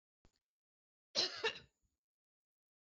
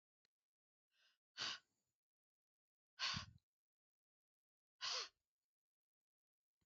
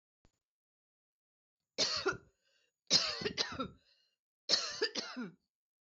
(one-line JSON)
{"cough_length": "2.8 s", "cough_amplitude": 2247, "cough_signal_mean_std_ratio": 0.26, "exhalation_length": "6.7 s", "exhalation_amplitude": 894, "exhalation_signal_mean_std_ratio": 0.26, "three_cough_length": "5.9 s", "three_cough_amplitude": 5443, "three_cough_signal_mean_std_ratio": 0.38, "survey_phase": "beta (2021-08-13 to 2022-03-07)", "age": "45-64", "gender": "Female", "wearing_mask": "No", "symptom_none": true, "smoker_status": "Ex-smoker", "respiratory_condition_asthma": false, "respiratory_condition_other": false, "recruitment_source": "REACT", "submission_delay": "3 days", "covid_test_result": "Negative", "covid_test_method": "RT-qPCR", "influenza_a_test_result": "Negative", "influenza_b_test_result": "Negative"}